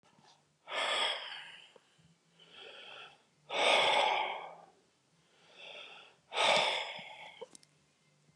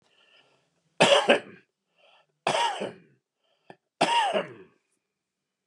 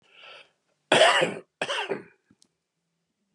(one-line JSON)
{"exhalation_length": "8.4 s", "exhalation_amplitude": 6141, "exhalation_signal_mean_std_ratio": 0.45, "three_cough_length": "5.7 s", "three_cough_amplitude": 20789, "three_cough_signal_mean_std_ratio": 0.35, "cough_length": "3.3 s", "cough_amplitude": 17431, "cough_signal_mean_std_ratio": 0.34, "survey_phase": "beta (2021-08-13 to 2022-03-07)", "age": "65+", "gender": "Male", "wearing_mask": "No", "symptom_none": true, "smoker_status": "Never smoked", "respiratory_condition_asthma": false, "respiratory_condition_other": false, "recruitment_source": "REACT", "submission_delay": "1 day", "covid_test_result": "Negative", "covid_test_method": "RT-qPCR", "influenza_a_test_result": "Negative", "influenza_b_test_result": "Negative"}